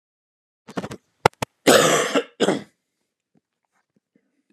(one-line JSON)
{"cough_length": "4.5 s", "cough_amplitude": 32768, "cough_signal_mean_std_ratio": 0.31, "survey_phase": "beta (2021-08-13 to 2022-03-07)", "age": "45-64", "gender": "Male", "wearing_mask": "No", "symptom_none": true, "smoker_status": "Never smoked", "respiratory_condition_asthma": true, "respiratory_condition_other": false, "recruitment_source": "REACT", "submission_delay": "1 day", "covid_test_result": "Negative", "covid_test_method": "RT-qPCR", "influenza_a_test_result": "Negative", "influenza_b_test_result": "Negative"}